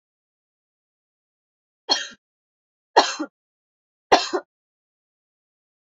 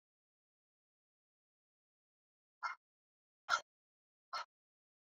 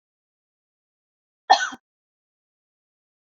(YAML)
three_cough_length: 5.9 s
three_cough_amplitude: 28746
three_cough_signal_mean_std_ratio: 0.2
exhalation_length: 5.1 s
exhalation_amplitude: 3369
exhalation_signal_mean_std_ratio: 0.17
cough_length: 3.3 s
cough_amplitude: 29010
cough_signal_mean_std_ratio: 0.15
survey_phase: beta (2021-08-13 to 2022-03-07)
age: 18-44
gender: Female
wearing_mask: 'No'
symptom_runny_or_blocked_nose: true
smoker_status: Never smoked
respiratory_condition_asthma: false
respiratory_condition_other: false
recruitment_source: Test and Trace
submission_delay: 2 days
covid_test_result: Positive
covid_test_method: RT-qPCR
covid_ct_value: 22.6
covid_ct_gene: ORF1ab gene